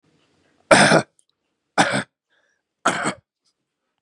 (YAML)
three_cough_length: 4.0 s
three_cough_amplitude: 32767
three_cough_signal_mean_std_ratio: 0.32
survey_phase: beta (2021-08-13 to 2022-03-07)
age: 18-44
gender: Male
wearing_mask: 'No'
symptom_none: true
smoker_status: Never smoked
respiratory_condition_asthma: false
respiratory_condition_other: false
recruitment_source: REACT
submission_delay: 1 day
covid_test_result: Negative
covid_test_method: RT-qPCR
influenza_a_test_result: Negative
influenza_b_test_result: Negative